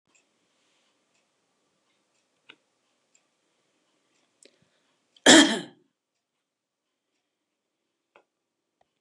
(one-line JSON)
{"cough_length": "9.0 s", "cough_amplitude": 28052, "cough_signal_mean_std_ratio": 0.14, "survey_phase": "beta (2021-08-13 to 2022-03-07)", "age": "65+", "gender": "Female", "wearing_mask": "No", "symptom_none": true, "smoker_status": "Never smoked", "respiratory_condition_asthma": false, "respiratory_condition_other": false, "recruitment_source": "REACT", "submission_delay": "2 days", "covid_test_result": "Negative", "covid_test_method": "RT-qPCR", "influenza_a_test_result": "Negative", "influenza_b_test_result": "Negative"}